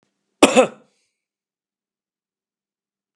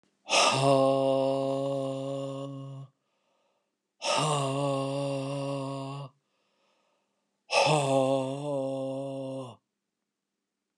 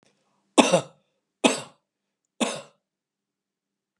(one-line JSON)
{"cough_length": "3.2 s", "cough_amplitude": 32768, "cough_signal_mean_std_ratio": 0.19, "exhalation_length": "10.8 s", "exhalation_amplitude": 13213, "exhalation_signal_mean_std_ratio": 0.62, "three_cough_length": "4.0 s", "three_cough_amplitude": 29798, "three_cough_signal_mean_std_ratio": 0.24, "survey_phase": "alpha (2021-03-01 to 2021-08-12)", "age": "65+", "gender": "Male", "wearing_mask": "No", "symptom_none": true, "smoker_status": "Never smoked", "respiratory_condition_asthma": false, "respiratory_condition_other": false, "recruitment_source": "REACT", "submission_delay": "1 day", "covid_test_result": "Negative", "covid_test_method": "RT-qPCR"}